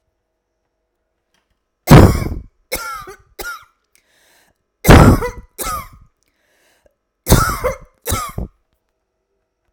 {"three_cough_length": "9.7 s", "three_cough_amplitude": 32768, "three_cough_signal_mean_std_ratio": 0.3, "survey_phase": "alpha (2021-03-01 to 2021-08-12)", "age": "45-64", "gender": "Female", "wearing_mask": "No", "symptom_none": true, "smoker_status": "Never smoked", "respiratory_condition_asthma": false, "respiratory_condition_other": false, "recruitment_source": "REACT", "submission_delay": "3 days", "covid_test_result": "Negative", "covid_test_method": "RT-qPCR"}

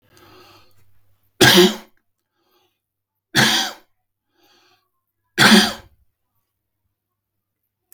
{"three_cough_length": "7.9 s", "three_cough_amplitude": 32768, "three_cough_signal_mean_std_ratio": 0.28, "survey_phase": "beta (2021-08-13 to 2022-03-07)", "age": "45-64", "gender": "Male", "wearing_mask": "No", "symptom_none": true, "smoker_status": "Never smoked", "respiratory_condition_asthma": false, "respiratory_condition_other": false, "recruitment_source": "REACT", "submission_delay": "1 day", "covid_test_result": "Negative", "covid_test_method": "RT-qPCR", "influenza_a_test_result": "Negative", "influenza_b_test_result": "Negative"}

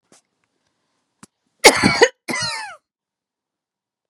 {"cough_length": "4.1 s", "cough_amplitude": 32768, "cough_signal_mean_std_ratio": 0.26, "survey_phase": "beta (2021-08-13 to 2022-03-07)", "age": "18-44", "gender": "Female", "wearing_mask": "No", "symptom_none": true, "smoker_status": "Never smoked", "respiratory_condition_asthma": false, "respiratory_condition_other": false, "recruitment_source": "REACT", "submission_delay": "1 day", "covid_test_result": "Negative", "covid_test_method": "RT-qPCR", "covid_ct_value": 38.1, "covid_ct_gene": "N gene", "influenza_a_test_result": "Negative", "influenza_b_test_result": "Negative"}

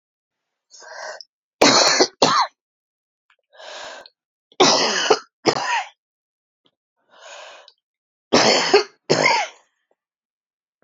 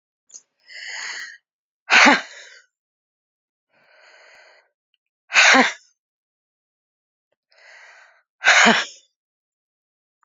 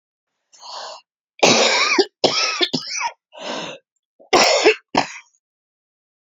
{"three_cough_length": "10.8 s", "three_cough_amplitude": 31886, "three_cough_signal_mean_std_ratio": 0.39, "exhalation_length": "10.2 s", "exhalation_amplitude": 30659, "exhalation_signal_mean_std_ratio": 0.27, "cough_length": "6.3 s", "cough_amplitude": 32768, "cough_signal_mean_std_ratio": 0.46, "survey_phase": "beta (2021-08-13 to 2022-03-07)", "age": "45-64", "gender": "Female", "wearing_mask": "No", "symptom_cough_any": true, "symptom_runny_or_blocked_nose": true, "symptom_shortness_of_breath": true, "symptom_fatigue": true, "symptom_headache": true, "symptom_change_to_sense_of_smell_or_taste": true, "symptom_loss_of_taste": true, "symptom_onset": "3 days", "smoker_status": "Ex-smoker", "respiratory_condition_asthma": true, "respiratory_condition_other": false, "recruitment_source": "Test and Trace", "submission_delay": "2 days", "covid_test_result": "Positive", "covid_test_method": "RT-qPCR", "covid_ct_value": 11.9, "covid_ct_gene": "ORF1ab gene", "covid_ct_mean": 12.2, "covid_viral_load": "97000000 copies/ml", "covid_viral_load_category": "High viral load (>1M copies/ml)"}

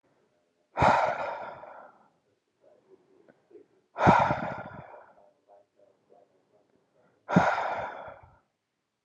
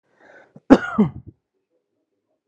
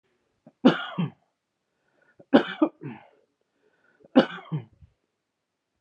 {"exhalation_length": "9.0 s", "exhalation_amplitude": 16116, "exhalation_signal_mean_std_ratio": 0.34, "cough_length": "2.5 s", "cough_amplitude": 32768, "cough_signal_mean_std_ratio": 0.23, "three_cough_length": "5.8 s", "three_cough_amplitude": 26083, "three_cough_signal_mean_std_ratio": 0.24, "survey_phase": "alpha (2021-03-01 to 2021-08-12)", "age": "18-44", "gender": "Male", "wearing_mask": "No", "symptom_none": true, "smoker_status": "Never smoked", "respiratory_condition_asthma": false, "respiratory_condition_other": false, "recruitment_source": "REACT", "submission_delay": "0 days", "covid_test_result": "Negative", "covid_test_method": "RT-qPCR"}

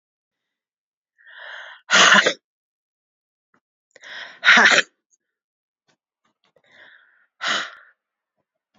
{"exhalation_length": "8.8 s", "exhalation_amplitude": 30605, "exhalation_signal_mean_std_ratio": 0.27, "survey_phase": "beta (2021-08-13 to 2022-03-07)", "age": "45-64", "gender": "Female", "wearing_mask": "No", "symptom_cough_any": true, "symptom_new_continuous_cough": true, "symptom_runny_or_blocked_nose": true, "symptom_sore_throat": true, "symptom_abdominal_pain": true, "symptom_fatigue": true, "symptom_fever_high_temperature": true, "symptom_headache": true, "symptom_other": true, "symptom_onset": "3 days", "smoker_status": "Ex-smoker", "respiratory_condition_asthma": true, "respiratory_condition_other": false, "recruitment_source": "Test and Trace", "submission_delay": "2 days", "covid_test_result": "Positive", "covid_test_method": "RT-qPCR", "covid_ct_value": 15.3, "covid_ct_gene": "ORF1ab gene", "covid_ct_mean": 16.8, "covid_viral_load": "3100000 copies/ml", "covid_viral_load_category": "High viral load (>1M copies/ml)"}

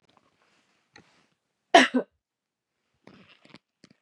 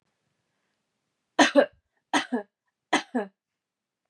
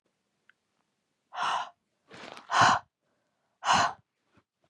{"cough_length": "4.0 s", "cough_amplitude": 23325, "cough_signal_mean_std_ratio": 0.17, "three_cough_length": "4.1 s", "three_cough_amplitude": 20786, "three_cough_signal_mean_std_ratio": 0.27, "exhalation_length": "4.7 s", "exhalation_amplitude": 13538, "exhalation_signal_mean_std_ratio": 0.33, "survey_phase": "beta (2021-08-13 to 2022-03-07)", "age": "18-44", "gender": "Female", "wearing_mask": "No", "symptom_cough_any": true, "symptom_runny_or_blocked_nose": true, "smoker_status": "Never smoked", "respiratory_condition_asthma": false, "respiratory_condition_other": false, "recruitment_source": "Test and Trace", "submission_delay": "2 days", "covid_test_result": "Positive", "covid_test_method": "RT-qPCR", "covid_ct_value": 24.7, "covid_ct_gene": "N gene"}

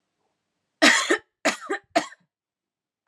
{"three_cough_length": "3.1 s", "three_cough_amplitude": 27028, "three_cough_signal_mean_std_ratio": 0.33, "survey_phase": "alpha (2021-03-01 to 2021-08-12)", "age": "18-44", "gender": "Female", "wearing_mask": "No", "symptom_cough_any": true, "symptom_shortness_of_breath": true, "symptom_headache": true, "symptom_onset": "2 days", "smoker_status": "Never smoked", "respiratory_condition_asthma": false, "respiratory_condition_other": false, "recruitment_source": "Test and Trace", "submission_delay": "1 day", "covid_ct_value": 28.4, "covid_ct_gene": "ORF1ab gene"}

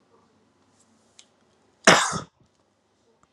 {"cough_length": "3.3 s", "cough_amplitude": 30748, "cough_signal_mean_std_ratio": 0.21, "survey_phase": "alpha (2021-03-01 to 2021-08-12)", "age": "18-44", "gender": "Male", "wearing_mask": "Yes", "symptom_none": true, "smoker_status": "Current smoker (1 to 10 cigarettes per day)", "respiratory_condition_asthma": false, "respiratory_condition_other": false, "recruitment_source": "Test and Trace", "submission_delay": "0 days", "covid_test_result": "Negative", "covid_test_method": "LFT"}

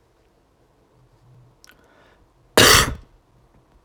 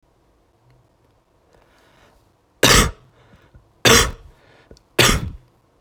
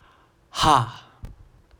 {"cough_length": "3.8 s", "cough_amplitude": 30249, "cough_signal_mean_std_ratio": 0.24, "three_cough_length": "5.8 s", "three_cough_amplitude": 30432, "three_cough_signal_mean_std_ratio": 0.3, "exhalation_length": "1.8 s", "exhalation_amplitude": 22328, "exhalation_signal_mean_std_ratio": 0.33, "survey_phase": "alpha (2021-03-01 to 2021-08-12)", "age": "18-44", "gender": "Male", "wearing_mask": "Yes", "symptom_none": true, "smoker_status": "Never smoked", "respiratory_condition_asthma": false, "respiratory_condition_other": false, "recruitment_source": "REACT", "submission_delay": "9 days", "covid_test_result": "Negative", "covid_test_method": "RT-qPCR"}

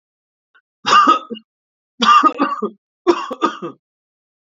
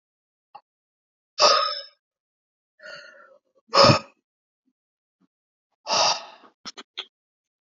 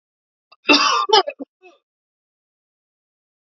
{"three_cough_length": "4.4 s", "three_cough_amplitude": 32767, "three_cough_signal_mean_std_ratio": 0.42, "exhalation_length": "7.8 s", "exhalation_amplitude": 26201, "exhalation_signal_mean_std_ratio": 0.27, "cough_length": "3.5 s", "cough_amplitude": 28408, "cough_signal_mean_std_ratio": 0.3, "survey_phase": "beta (2021-08-13 to 2022-03-07)", "age": "18-44", "gender": "Male", "wearing_mask": "No", "symptom_none": true, "symptom_onset": "3 days", "smoker_status": "Never smoked", "respiratory_condition_asthma": false, "respiratory_condition_other": false, "recruitment_source": "Test and Trace", "submission_delay": "2 days", "covid_test_result": "Positive", "covid_test_method": "RT-qPCR", "covid_ct_value": 22.9, "covid_ct_gene": "ORF1ab gene", "covid_ct_mean": 23.3, "covid_viral_load": "23000 copies/ml", "covid_viral_load_category": "Low viral load (10K-1M copies/ml)"}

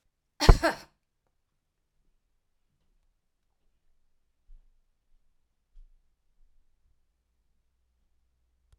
{"cough_length": "8.8 s", "cough_amplitude": 32767, "cough_signal_mean_std_ratio": 0.11, "survey_phase": "alpha (2021-03-01 to 2021-08-12)", "age": "45-64", "gender": "Female", "wearing_mask": "No", "symptom_none": true, "smoker_status": "Never smoked", "respiratory_condition_asthma": false, "respiratory_condition_other": false, "recruitment_source": "REACT", "submission_delay": "2 days", "covid_test_result": "Negative", "covid_test_method": "RT-qPCR"}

